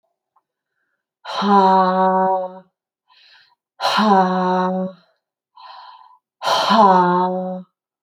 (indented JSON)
{
  "exhalation_length": "8.0 s",
  "exhalation_amplitude": 27557,
  "exhalation_signal_mean_std_ratio": 0.57,
  "survey_phase": "alpha (2021-03-01 to 2021-08-12)",
  "age": "45-64",
  "gender": "Female",
  "wearing_mask": "No",
  "symptom_cough_any": true,
  "symptom_shortness_of_breath": true,
  "smoker_status": "Ex-smoker",
  "respiratory_condition_asthma": true,
  "respiratory_condition_other": false,
  "recruitment_source": "REACT",
  "submission_delay": "8 days",
  "covid_test_result": "Negative",
  "covid_test_method": "RT-qPCR"
}